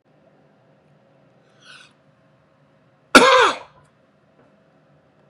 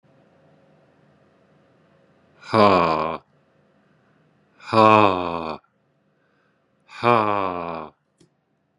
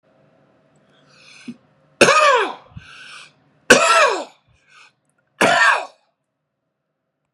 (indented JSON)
{
  "cough_length": "5.3 s",
  "cough_amplitude": 32768,
  "cough_signal_mean_std_ratio": 0.22,
  "exhalation_length": "8.8 s",
  "exhalation_amplitude": 32082,
  "exhalation_signal_mean_std_ratio": 0.31,
  "three_cough_length": "7.3 s",
  "three_cough_amplitude": 32768,
  "three_cough_signal_mean_std_ratio": 0.36,
  "survey_phase": "beta (2021-08-13 to 2022-03-07)",
  "age": "45-64",
  "gender": "Male",
  "wearing_mask": "No",
  "symptom_none": true,
  "smoker_status": "Current smoker (e-cigarettes or vapes only)",
  "respiratory_condition_asthma": false,
  "respiratory_condition_other": false,
  "recruitment_source": "REACT",
  "submission_delay": "0 days",
  "covid_test_result": "Negative",
  "covid_test_method": "RT-qPCR",
  "influenza_a_test_result": "Negative",
  "influenza_b_test_result": "Negative"
}